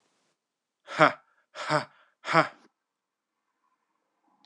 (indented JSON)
{
  "exhalation_length": "4.5 s",
  "exhalation_amplitude": 21926,
  "exhalation_signal_mean_std_ratio": 0.23,
  "survey_phase": "beta (2021-08-13 to 2022-03-07)",
  "age": "45-64",
  "gender": "Male",
  "wearing_mask": "No",
  "symptom_cough_any": true,
  "symptom_runny_or_blocked_nose": true,
  "symptom_fatigue": true,
  "symptom_headache": true,
  "symptom_other": true,
  "symptom_onset": "2 days",
  "smoker_status": "Never smoked",
  "respiratory_condition_asthma": false,
  "respiratory_condition_other": false,
  "recruitment_source": "Test and Trace",
  "submission_delay": "1 day",
  "covid_test_result": "Positive",
  "covid_test_method": "ePCR"
}